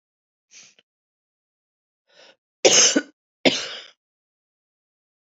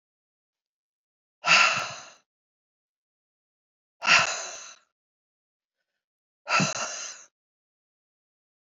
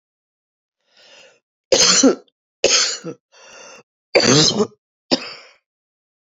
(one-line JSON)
{"cough_length": "5.4 s", "cough_amplitude": 29588, "cough_signal_mean_std_ratio": 0.24, "exhalation_length": "8.7 s", "exhalation_amplitude": 18081, "exhalation_signal_mean_std_ratio": 0.28, "three_cough_length": "6.4 s", "three_cough_amplitude": 30947, "three_cough_signal_mean_std_ratio": 0.38, "survey_phase": "beta (2021-08-13 to 2022-03-07)", "age": "45-64", "gender": "Female", "wearing_mask": "No", "symptom_cough_any": true, "symptom_runny_or_blocked_nose": true, "symptom_sore_throat": true, "symptom_fatigue": true, "symptom_headache": true, "symptom_change_to_sense_of_smell_or_taste": true, "symptom_loss_of_taste": true, "symptom_onset": "5 days", "smoker_status": "Current smoker (11 or more cigarettes per day)", "respiratory_condition_asthma": false, "respiratory_condition_other": false, "recruitment_source": "Test and Trace", "submission_delay": "3 days", "covid_test_result": "Positive", "covid_test_method": "RT-qPCR"}